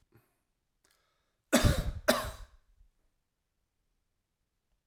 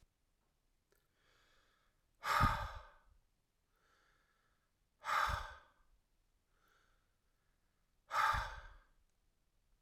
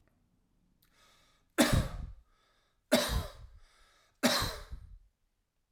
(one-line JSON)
{"cough_length": "4.9 s", "cough_amplitude": 11327, "cough_signal_mean_std_ratio": 0.26, "exhalation_length": "9.8 s", "exhalation_amplitude": 3831, "exhalation_signal_mean_std_ratio": 0.3, "three_cough_length": "5.7 s", "three_cough_amplitude": 9717, "three_cough_signal_mean_std_ratio": 0.35, "survey_phase": "alpha (2021-03-01 to 2021-08-12)", "age": "45-64", "gender": "Male", "wearing_mask": "No", "symptom_none": true, "smoker_status": "Never smoked", "respiratory_condition_asthma": false, "respiratory_condition_other": false, "recruitment_source": "REACT", "submission_delay": "1 day", "covid_test_result": "Negative", "covid_test_method": "RT-qPCR"}